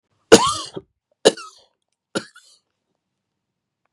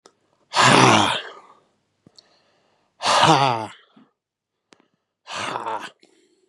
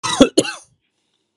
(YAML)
three_cough_length: 3.9 s
three_cough_amplitude: 32768
three_cough_signal_mean_std_ratio: 0.2
exhalation_length: 6.5 s
exhalation_amplitude: 32767
exhalation_signal_mean_std_ratio: 0.38
cough_length: 1.4 s
cough_amplitude: 32768
cough_signal_mean_std_ratio: 0.33
survey_phase: beta (2021-08-13 to 2022-03-07)
age: 45-64
gender: Male
wearing_mask: 'No'
symptom_none: true
symptom_onset: 13 days
smoker_status: Never smoked
respiratory_condition_asthma: false
respiratory_condition_other: false
recruitment_source: REACT
submission_delay: 2 days
covid_test_result: Negative
covid_test_method: RT-qPCR
influenza_a_test_result: Negative
influenza_b_test_result: Negative